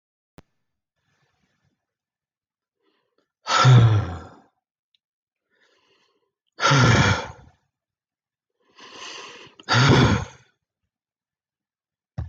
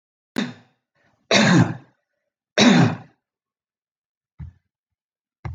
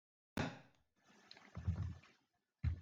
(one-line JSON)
{"exhalation_length": "12.3 s", "exhalation_amplitude": 23024, "exhalation_signal_mean_std_ratio": 0.32, "three_cough_length": "5.5 s", "three_cough_amplitude": 27479, "three_cough_signal_mean_std_ratio": 0.33, "cough_length": "2.8 s", "cough_amplitude": 1366, "cough_signal_mean_std_ratio": 0.41, "survey_phase": "beta (2021-08-13 to 2022-03-07)", "age": "45-64", "gender": "Male", "wearing_mask": "No", "symptom_change_to_sense_of_smell_or_taste": true, "symptom_onset": "12 days", "smoker_status": "Never smoked", "respiratory_condition_asthma": false, "respiratory_condition_other": false, "recruitment_source": "REACT", "submission_delay": "1 day", "covid_test_result": "Negative", "covid_test_method": "RT-qPCR"}